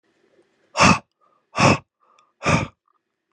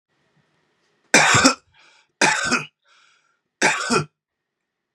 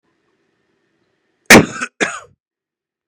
exhalation_length: 3.3 s
exhalation_amplitude: 31482
exhalation_signal_mean_std_ratio: 0.33
three_cough_length: 4.9 s
three_cough_amplitude: 32767
three_cough_signal_mean_std_ratio: 0.37
cough_length: 3.1 s
cough_amplitude: 32768
cough_signal_mean_std_ratio: 0.23
survey_phase: beta (2021-08-13 to 2022-03-07)
age: 18-44
gender: Male
wearing_mask: 'No'
symptom_cough_any: true
symptom_onset: 5 days
smoker_status: Never smoked
respiratory_condition_asthma: false
respiratory_condition_other: false
recruitment_source: REACT
submission_delay: 8 days
covid_test_result: Negative
covid_test_method: RT-qPCR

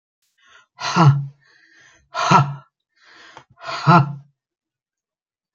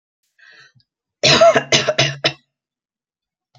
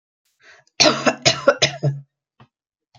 exhalation_length: 5.5 s
exhalation_amplitude: 28515
exhalation_signal_mean_std_ratio: 0.35
three_cough_length: 3.6 s
three_cough_amplitude: 32767
three_cough_signal_mean_std_ratio: 0.37
cough_length: 3.0 s
cough_amplitude: 30873
cough_signal_mean_std_ratio: 0.37
survey_phase: alpha (2021-03-01 to 2021-08-12)
age: 65+
gender: Female
wearing_mask: 'No'
symptom_none: true
symptom_fatigue: true
smoker_status: Current smoker (1 to 10 cigarettes per day)
respiratory_condition_asthma: false
respiratory_condition_other: false
recruitment_source: REACT
submission_delay: 3 days
covid_test_result: Negative
covid_test_method: RT-qPCR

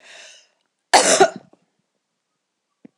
cough_length: 3.0 s
cough_amplitude: 26028
cough_signal_mean_std_ratio: 0.27
survey_phase: alpha (2021-03-01 to 2021-08-12)
age: 45-64
gender: Female
wearing_mask: 'No'
symptom_none: true
smoker_status: Ex-smoker
respiratory_condition_asthma: false
respiratory_condition_other: false
recruitment_source: REACT
submission_delay: 3 days
covid_test_result: Negative
covid_test_method: RT-qPCR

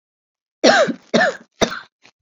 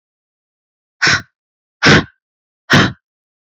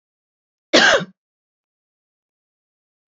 three_cough_length: 2.2 s
three_cough_amplitude: 28843
three_cough_signal_mean_std_ratio: 0.42
exhalation_length: 3.6 s
exhalation_amplitude: 32768
exhalation_signal_mean_std_ratio: 0.33
cough_length: 3.1 s
cough_amplitude: 29356
cough_signal_mean_std_ratio: 0.24
survey_phase: beta (2021-08-13 to 2022-03-07)
age: 18-44
gender: Female
wearing_mask: 'No'
symptom_cough_any: true
smoker_status: Current smoker (1 to 10 cigarettes per day)
respiratory_condition_asthma: false
respiratory_condition_other: false
recruitment_source: REACT
submission_delay: 1 day
covid_test_result: Negative
covid_test_method: RT-qPCR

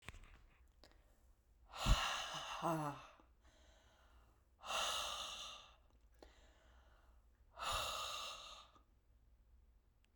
exhalation_length: 10.2 s
exhalation_amplitude: 3010
exhalation_signal_mean_std_ratio: 0.44
survey_phase: beta (2021-08-13 to 2022-03-07)
age: 45-64
gender: Female
wearing_mask: 'No'
symptom_cough_any: true
symptom_new_continuous_cough: true
symptom_runny_or_blocked_nose: true
symptom_shortness_of_breath: true
symptom_sore_throat: true
symptom_headache: true
symptom_onset: 2 days
smoker_status: Never smoked
respiratory_condition_asthma: false
respiratory_condition_other: false
recruitment_source: Test and Trace
submission_delay: 1 day
covid_test_result: Positive
covid_test_method: RT-qPCR
covid_ct_value: 25.5
covid_ct_gene: ORF1ab gene
covid_ct_mean: 26.5
covid_viral_load: 2100 copies/ml
covid_viral_load_category: Minimal viral load (< 10K copies/ml)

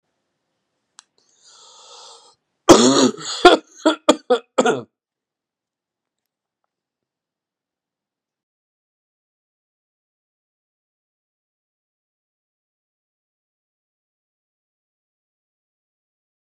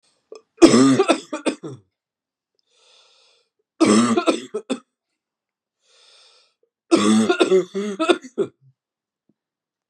cough_length: 16.6 s
cough_amplitude: 32768
cough_signal_mean_std_ratio: 0.18
three_cough_length: 9.9 s
three_cough_amplitude: 32768
three_cough_signal_mean_std_ratio: 0.38
survey_phase: beta (2021-08-13 to 2022-03-07)
age: 65+
gender: Male
wearing_mask: 'No'
symptom_cough_any: true
symptom_onset: 8 days
smoker_status: Never smoked
respiratory_condition_asthma: false
respiratory_condition_other: false
recruitment_source: REACT
submission_delay: 3 days
covid_test_result: Negative
covid_test_method: RT-qPCR
influenza_a_test_result: Negative
influenza_b_test_result: Negative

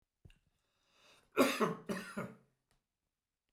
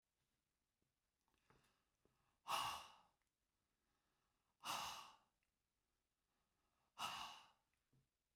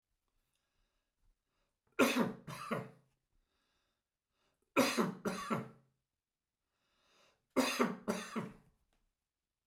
cough_length: 3.5 s
cough_amplitude: 6591
cough_signal_mean_std_ratio: 0.31
exhalation_length: 8.4 s
exhalation_amplitude: 860
exhalation_signal_mean_std_ratio: 0.3
three_cough_length: 9.7 s
three_cough_amplitude: 5829
three_cough_signal_mean_std_ratio: 0.34
survey_phase: beta (2021-08-13 to 2022-03-07)
age: 65+
gender: Male
wearing_mask: 'No'
symptom_none: true
smoker_status: Ex-smoker
respiratory_condition_asthma: true
respiratory_condition_other: false
recruitment_source: REACT
submission_delay: 1 day
covid_test_result: Negative
covid_test_method: RT-qPCR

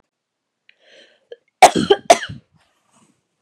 cough_length: 3.4 s
cough_amplitude: 32768
cough_signal_mean_std_ratio: 0.22
survey_phase: beta (2021-08-13 to 2022-03-07)
age: 18-44
gender: Female
wearing_mask: 'No'
symptom_cough_any: true
symptom_runny_or_blocked_nose: true
symptom_fatigue: true
symptom_headache: true
symptom_onset: 1 day
smoker_status: Ex-smoker
respiratory_condition_asthma: true
respiratory_condition_other: false
recruitment_source: Test and Trace
submission_delay: 1 day
covid_test_result: Positive
covid_test_method: RT-qPCR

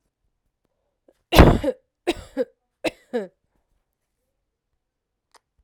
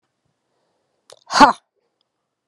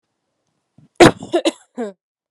three_cough_length: 5.6 s
three_cough_amplitude: 32768
three_cough_signal_mean_std_ratio: 0.22
exhalation_length: 2.5 s
exhalation_amplitude: 32768
exhalation_signal_mean_std_ratio: 0.2
cough_length: 2.3 s
cough_amplitude: 32768
cough_signal_mean_std_ratio: 0.26
survey_phase: alpha (2021-03-01 to 2021-08-12)
age: 18-44
gender: Female
wearing_mask: 'Yes'
symptom_fatigue: true
symptom_headache: true
smoker_status: Never smoked
respiratory_condition_asthma: false
respiratory_condition_other: false
recruitment_source: Test and Trace
submission_delay: 2 days
covid_test_result: Positive
covid_test_method: RT-qPCR
covid_ct_value: 17.4
covid_ct_gene: ORF1ab gene
covid_ct_mean: 18.9
covid_viral_load: 620000 copies/ml
covid_viral_load_category: Low viral load (10K-1M copies/ml)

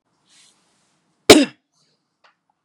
cough_length: 2.6 s
cough_amplitude: 32768
cough_signal_mean_std_ratio: 0.18
survey_phase: beta (2021-08-13 to 2022-03-07)
age: 18-44
gender: Male
wearing_mask: 'No'
symptom_none: true
smoker_status: Ex-smoker
respiratory_condition_asthma: false
respiratory_condition_other: false
recruitment_source: REACT
submission_delay: 2 days
covid_test_result: Negative
covid_test_method: RT-qPCR
influenza_a_test_result: Negative
influenza_b_test_result: Negative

